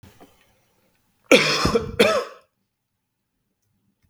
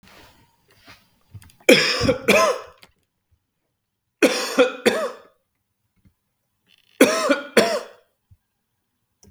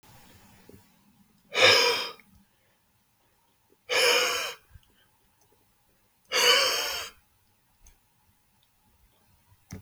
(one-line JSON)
{"cough_length": "4.1 s", "cough_amplitude": 32768, "cough_signal_mean_std_ratio": 0.33, "three_cough_length": "9.3 s", "three_cough_amplitude": 32768, "three_cough_signal_mean_std_ratio": 0.35, "exhalation_length": "9.8 s", "exhalation_amplitude": 16382, "exhalation_signal_mean_std_ratio": 0.35, "survey_phase": "beta (2021-08-13 to 2022-03-07)", "age": "18-44", "gender": "Male", "wearing_mask": "No", "symptom_none": true, "smoker_status": "Never smoked", "respiratory_condition_asthma": false, "respiratory_condition_other": false, "recruitment_source": "REACT", "submission_delay": "0 days", "covid_test_result": "Negative", "covid_test_method": "RT-qPCR", "influenza_a_test_result": "Negative", "influenza_b_test_result": "Negative"}